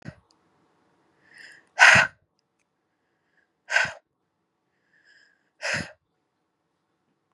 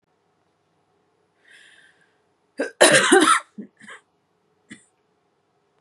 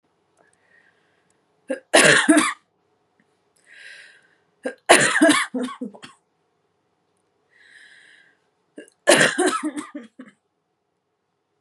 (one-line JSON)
{"exhalation_length": "7.3 s", "exhalation_amplitude": 30305, "exhalation_signal_mean_std_ratio": 0.21, "cough_length": "5.8 s", "cough_amplitude": 31723, "cough_signal_mean_std_ratio": 0.27, "three_cough_length": "11.6 s", "three_cough_amplitude": 32767, "three_cough_signal_mean_std_ratio": 0.32, "survey_phase": "beta (2021-08-13 to 2022-03-07)", "age": "18-44", "gender": "Female", "wearing_mask": "No", "symptom_runny_or_blocked_nose": true, "symptom_fatigue": true, "symptom_headache": true, "symptom_onset": "13 days", "smoker_status": "Current smoker (e-cigarettes or vapes only)", "respiratory_condition_asthma": false, "respiratory_condition_other": false, "recruitment_source": "REACT", "submission_delay": "0 days", "covid_test_result": "Negative", "covid_test_method": "RT-qPCR"}